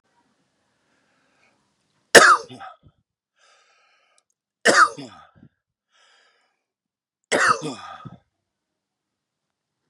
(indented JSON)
{
  "three_cough_length": "9.9 s",
  "three_cough_amplitude": 32768,
  "three_cough_signal_mean_std_ratio": 0.22,
  "survey_phase": "beta (2021-08-13 to 2022-03-07)",
  "age": "18-44",
  "gender": "Male",
  "wearing_mask": "No",
  "symptom_cough_any": true,
  "symptom_abdominal_pain": true,
  "symptom_fatigue": true,
  "symptom_headache": true,
  "symptom_change_to_sense_of_smell_or_taste": true,
  "symptom_loss_of_taste": true,
  "smoker_status": "Never smoked",
  "respiratory_condition_asthma": false,
  "respiratory_condition_other": false,
  "recruitment_source": "Test and Trace",
  "submission_delay": "1 day",
  "covid_test_result": "Positive",
  "covid_test_method": "RT-qPCR",
  "covid_ct_value": 35.4,
  "covid_ct_gene": "ORF1ab gene"
}